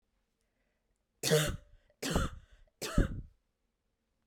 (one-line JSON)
{"three_cough_length": "4.3 s", "three_cough_amplitude": 7354, "three_cough_signal_mean_std_ratio": 0.35, "survey_phase": "beta (2021-08-13 to 2022-03-07)", "age": "18-44", "gender": "Female", "wearing_mask": "No", "symptom_none": true, "smoker_status": "Never smoked", "respiratory_condition_asthma": false, "respiratory_condition_other": false, "recruitment_source": "REACT", "submission_delay": "1 day", "covid_test_result": "Negative", "covid_test_method": "RT-qPCR", "influenza_a_test_result": "Unknown/Void", "influenza_b_test_result": "Unknown/Void"}